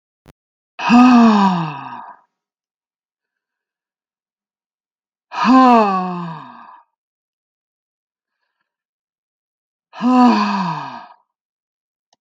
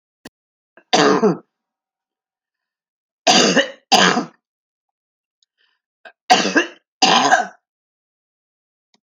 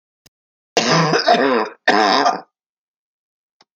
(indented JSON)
{
  "exhalation_length": "12.2 s",
  "exhalation_amplitude": 30505,
  "exhalation_signal_mean_std_ratio": 0.38,
  "three_cough_length": "9.1 s",
  "three_cough_amplitude": 32767,
  "three_cough_signal_mean_std_ratio": 0.36,
  "cough_length": "3.8 s",
  "cough_amplitude": 29133,
  "cough_signal_mean_std_ratio": 0.51,
  "survey_phase": "alpha (2021-03-01 to 2021-08-12)",
  "age": "65+",
  "gender": "Female",
  "wearing_mask": "No",
  "symptom_change_to_sense_of_smell_or_taste": true,
  "symptom_loss_of_taste": true,
  "smoker_status": "Never smoked",
  "respiratory_condition_asthma": false,
  "respiratory_condition_other": true,
  "recruitment_source": "REACT",
  "submission_delay": "2 days",
  "covid_test_result": "Negative",
  "covid_test_method": "RT-qPCR"
}